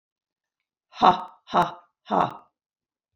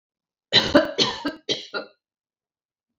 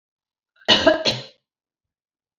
exhalation_length: 3.2 s
exhalation_amplitude: 25169
exhalation_signal_mean_std_ratio: 0.3
three_cough_length: 3.0 s
three_cough_amplitude: 25791
three_cough_signal_mean_std_ratio: 0.36
cough_length: 2.4 s
cough_amplitude: 28797
cough_signal_mean_std_ratio: 0.32
survey_phase: beta (2021-08-13 to 2022-03-07)
age: 45-64
gender: Female
wearing_mask: 'No'
symptom_none: true
smoker_status: Never smoked
respiratory_condition_asthma: false
respiratory_condition_other: false
recruitment_source: REACT
submission_delay: 0 days
covid_test_result: Negative
covid_test_method: RT-qPCR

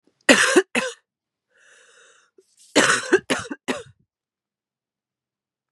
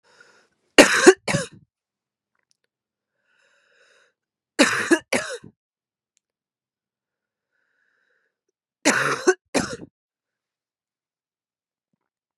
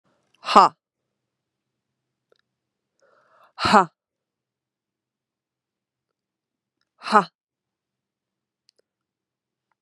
cough_length: 5.7 s
cough_amplitude: 32767
cough_signal_mean_std_ratio: 0.31
three_cough_length: 12.4 s
three_cough_amplitude: 32768
three_cough_signal_mean_std_ratio: 0.23
exhalation_length: 9.8 s
exhalation_amplitude: 32767
exhalation_signal_mean_std_ratio: 0.16
survey_phase: beta (2021-08-13 to 2022-03-07)
age: 18-44
gender: Female
wearing_mask: 'No'
symptom_new_continuous_cough: true
symptom_runny_or_blocked_nose: true
symptom_fatigue: true
symptom_headache: true
symptom_onset: 5 days
smoker_status: Never smoked
respiratory_condition_asthma: false
respiratory_condition_other: false
recruitment_source: Test and Trace
submission_delay: 2 days
covid_test_result: Positive
covid_test_method: RT-qPCR
covid_ct_value: 17.8
covid_ct_gene: ORF1ab gene
covid_ct_mean: 18.2
covid_viral_load: 1100000 copies/ml
covid_viral_load_category: High viral load (>1M copies/ml)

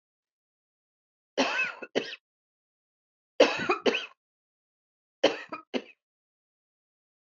three_cough_length: 7.3 s
three_cough_amplitude: 17460
three_cough_signal_mean_std_ratio: 0.28
survey_phase: beta (2021-08-13 to 2022-03-07)
age: 45-64
gender: Female
wearing_mask: 'No'
symptom_runny_or_blocked_nose: true
smoker_status: Never smoked
respiratory_condition_asthma: false
respiratory_condition_other: false
recruitment_source: REACT
submission_delay: 3 days
covid_test_result: Negative
covid_test_method: RT-qPCR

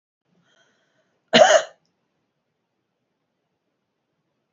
cough_length: 4.5 s
cough_amplitude: 28084
cough_signal_mean_std_ratio: 0.2
survey_phase: beta (2021-08-13 to 2022-03-07)
age: 45-64
gender: Female
wearing_mask: 'No'
symptom_runny_or_blocked_nose: true
symptom_headache: true
smoker_status: Never smoked
respiratory_condition_asthma: true
respiratory_condition_other: false
recruitment_source: Test and Trace
submission_delay: 3 days
covid_test_result: Negative
covid_test_method: RT-qPCR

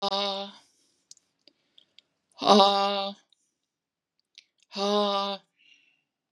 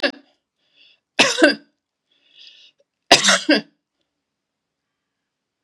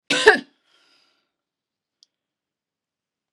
exhalation_length: 6.3 s
exhalation_amplitude: 23617
exhalation_signal_mean_std_ratio: 0.34
three_cough_length: 5.6 s
three_cough_amplitude: 32768
three_cough_signal_mean_std_ratio: 0.28
cough_length: 3.3 s
cough_amplitude: 32768
cough_signal_mean_std_ratio: 0.19
survey_phase: beta (2021-08-13 to 2022-03-07)
age: 45-64
gender: Female
wearing_mask: 'No'
symptom_none: true
smoker_status: Never smoked
respiratory_condition_asthma: false
respiratory_condition_other: false
recruitment_source: REACT
submission_delay: 2 days
covid_test_result: Negative
covid_test_method: RT-qPCR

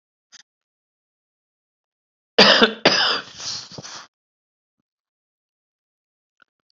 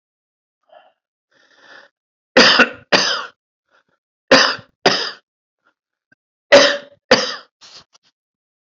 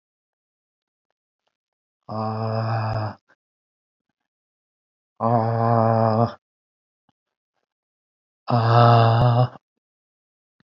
cough_length: 6.7 s
cough_amplitude: 30909
cough_signal_mean_std_ratio: 0.25
three_cough_length: 8.6 s
three_cough_amplitude: 32768
three_cough_signal_mean_std_ratio: 0.31
exhalation_length: 10.8 s
exhalation_amplitude: 27284
exhalation_signal_mean_std_ratio: 0.41
survey_phase: beta (2021-08-13 to 2022-03-07)
age: 65+
gender: Male
wearing_mask: 'No'
symptom_cough_any: true
symptom_runny_or_blocked_nose: true
symptom_sore_throat: true
symptom_headache: true
symptom_onset: 2 days
smoker_status: Current smoker (e-cigarettes or vapes only)
respiratory_condition_asthma: false
respiratory_condition_other: false
recruitment_source: Test and Trace
submission_delay: 1 day
covid_test_result: Positive
covid_test_method: RT-qPCR
covid_ct_value: 22.8
covid_ct_gene: N gene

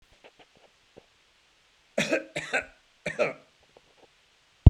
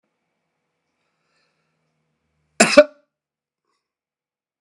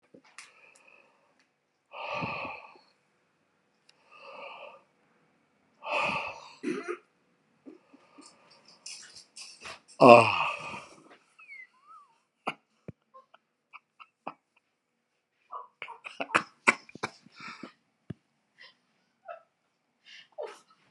three_cough_length: 4.7 s
three_cough_amplitude: 32768
three_cough_signal_mean_std_ratio: 0.19
cough_length: 4.6 s
cough_amplitude: 32768
cough_signal_mean_std_ratio: 0.15
exhalation_length: 20.9 s
exhalation_amplitude: 29348
exhalation_signal_mean_std_ratio: 0.2
survey_phase: beta (2021-08-13 to 2022-03-07)
age: 65+
gender: Male
wearing_mask: 'No'
symptom_cough_any: true
symptom_runny_or_blocked_nose: true
symptom_headache: true
symptom_onset: 8 days
smoker_status: Ex-smoker
respiratory_condition_asthma: false
respiratory_condition_other: false
recruitment_source: REACT
submission_delay: 3 days
covid_test_result: Negative
covid_test_method: RT-qPCR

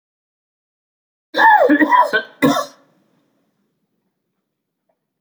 cough_length: 5.2 s
cough_amplitude: 28159
cough_signal_mean_std_ratio: 0.36
survey_phase: beta (2021-08-13 to 2022-03-07)
age: 65+
gender: Male
wearing_mask: 'No'
symptom_cough_any: true
symptom_runny_or_blocked_nose: true
symptom_fatigue: true
symptom_change_to_sense_of_smell_or_taste: true
symptom_onset: 4 days
smoker_status: Never smoked
respiratory_condition_asthma: false
respiratory_condition_other: false
recruitment_source: Test and Trace
submission_delay: 2 days
covid_test_result: Positive
covid_test_method: ePCR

